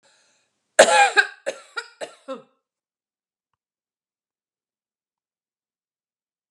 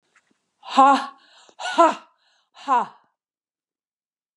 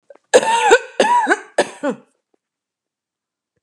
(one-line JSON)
{"three_cough_length": "6.5 s", "three_cough_amplitude": 32768, "three_cough_signal_mean_std_ratio": 0.21, "exhalation_length": "4.4 s", "exhalation_amplitude": 23991, "exhalation_signal_mean_std_ratio": 0.32, "cough_length": "3.6 s", "cough_amplitude": 32768, "cough_signal_mean_std_ratio": 0.43, "survey_phase": "beta (2021-08-13 to 2022-03-07)", "age": "65+", "gender": "Female", "wearing_mask": "No", "symptom_none": true, "smoker_status": "Ex-smoker", "respiratory_condition_asthma": false, "respiratory_condition_other": false, "recruitment_source": "REACT", "submission_delay": "1 day", "covid_test_result": "Negative", "covid_test_method": "RT-qPCR"}